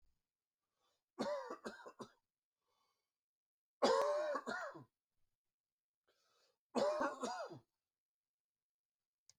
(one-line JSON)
{"three_cough_length": "9.4 s", "three_cough_amplitude": 3047, "three_cough_signal_mean_std_ratio": 0.36, "survey_phase": "beta (2021-08-13 to 2022-03-07)", "age": "45-64", "gender": "Male", "wearing_mask": "No", "symptom_new_continuous_cough": true, "symptom_shortness_of_breath": true, "symptom_sore_throat": true, "symptom_fatigue": true, "symptom_fever_high_temperature": true, "symptom_headache": true, "symptom_onset": "4 days", "smoker_status": "Never smoked", "respiratory_condition_asthma": false, "respiratory_condition_other": false, "recruitment_source": "Test and Trace", "submission_delay": "2 days", "covid_test_result": "Positive", "covid_test_method": "RT-qPCR"}